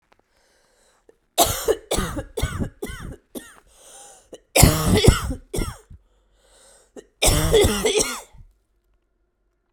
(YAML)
three_cough_length: 9.7 s
three_cough_amplitude: 32768
three_cough_signal_mean_std_ratio: 0.41
survey_phase: beta (2021-08-13 to 2022-03-07)
age: 18-44
gender: Female
wearing_mask: 'No'
symptom_cough_any: true
symptom_new_continuous_cough: true
symptom_runny_or_blocked_nose: true
symptom_fatigue: true
symptom_fever_high_temperature: true
symptom_headache: true
symptom_change_to_sense_of_smell_or_taste: true
symptom_loss_of_taste: true
symptom_onset: 6 days
smoker_status: Never smoked
respiratory_condition_asthma: false
respiratory_condition_other: false
recruitment_source: Test and Trace
submission_delay: 2 days
covid_test_result: Positive
covid_test_method: RT-qPCR
covid_ct_value: 17.3
covid_ct_gene: ORF1ab gene
covid_ct_mean: 17.6
covid_viral_load: 1600000 copies/ml
covid_viral_load_category: High viral load (>1M copies/ml)